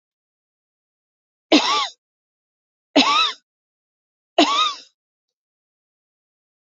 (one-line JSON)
{"three_cough_length": "6.7 s", "three_cough_amplitude": 27495, "three_cough_signal_mean_std_ratio": 0.31, "survey_phase": "beta (2021-08-13 to 2022-03-07)", "age": "18-44", "gender": "Female", "wearing_mask": "No", "symptom_none": true, "smoker_status": "Never smoked", "respiratory_condition_asthma": false, "respiratory_condition_other": false, "recruitment_source": "REACT", "submission_delay": "1 day", "covid_test_result": "Negative", "covid_test_method": "RT-qPCR", "influenza_a_test_result": "Unknown/Void", "influenza_b_test_result": "Unknown/Void"}